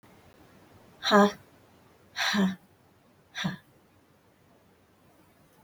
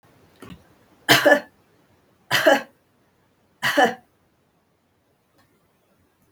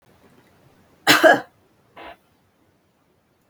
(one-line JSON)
{"exhalation_length": "5.6 s", "exhalation_amplitude": 14479, "exhalation_signal_mean_std_ratio": 0.3, "three_cough_length": "6.3 s", "three_cough_amplitude": 32768, "three_cough_signal_mean_std_ratio": 0.29, "cough_length": "3.5 s", "cough_amplitude": 32768, "cough_signal_mean_std_ratio": 0.24, "survey_phase": "beta (2021-08-13 to 2022-03-07)", "age": "45-64", "gender": "Female", "wearing_mask": "No", "symptom_none": true, "smoker_status": "Never smoked", "respiratory_condition_asthma": false, "respiratory_condition_other": false, "recruitment_source": "REACT", "submission_delay": "2 days", "covid_test_result": "Negative", "covid_test_method": "RT-qPCR"}